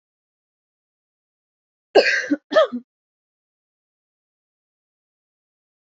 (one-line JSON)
{"cough_length": "5.9 s", "cough_amplitude": 29363, "cough_signal_mean_std_ratio": 0.22, "survey_phase": "beta (2021-08-13 to 2022-03-07)", "age": "18-44", "gender": "Female", "wearing_mask": "No", "symptom_runny_or_blocked_nose": true, "symptom_diarrhoea": true, "symptom_headache": true, "smoker_status": "Never smoked", "respiratory_condition_asthma": false, "respiratory_condition_other": false, "recruitment_source": "Test and Trace", "submission_delay": "2 days", "covid_test_result": "Positive", "covid_test_method": "RT-qPCR", "covid_ct_value": 28.3, "covid_ct_gene": "N gene", "covid_ct_mean": 29.2, "covid_viral_load": "270 copies/ml", "covid_viral_load_category": "Minimal viral load (< 10K copies/ml)"}